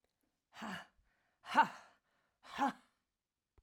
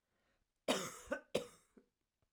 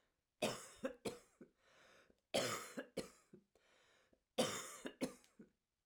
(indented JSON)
{
  "exhalation_length": "3.6 s",
  "exhalation_amplitude": 4686,
  "exhalation_signal_mean_std_ratio": 0.26,
  "cough_length": "2.3 s",
  "cough_amplitude": 3078,
  "cough_signal_mean_std_ratio": 0.33,
  "three_cough_length": "5.9 s",
  "three_cough_amplitude": 1989,
  "three_cough_signal_mean_std_ratio": 0.38,
  "survey_phase": "alpha (2021-03-01 to 2021-08-12)",
  "age": "65+",
  "gender": "Female",
  "wearing_mask": "No",
  "symptom_none": true,
  "smoker_status": "Never smoked",
  "respiratory_condition_asthma": false,
  "respiratory_condition_other": false,
  "recruitment_source": "REACT",
  "submission_delay": "1 day",
  "covid_test_result": "Negative",
  "covid_test_method": "RT-qPCR"
}